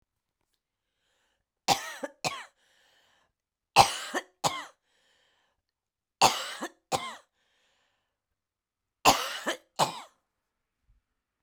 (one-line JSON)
{"cough_length": "11.4 s", "cough_amplitude": 19495, "cough_signal_mean_std_ratio": 0.25, "survey_phase": "beta (2021-08-13 to 2022-03-07)", "age": "65+", "gender": "Female", "wearing_mask": "No", "symptom_cough_any": true, "symptom_runny_or_blocked_nose": true, "symptom_sore_throat": true, "symptom_abdominal_pain": true, "symptom_fatigue": true, "symptom_fever_high_temperature": true, "symptom_headache": true, "symptom_onset": "3 days", "smoker_status": "Never smoked", "respiratory_condition_asthma": false, "respiratory_condition_other": false, "recruitment_source": "Test and Trace", "submission_delay": "1 day", "covid_test_result": "Positive", "covid_test_method": "RT-qPCR", "covid_ct_value": 18.6, "covid_ct_gene": "ORF1ab gene", "covid_ct_mean": 19.6, "covid_viral_load": "380000 copies/ml", "covid_viral_load_category": "Low viral load (10K-1M copies/ml)"}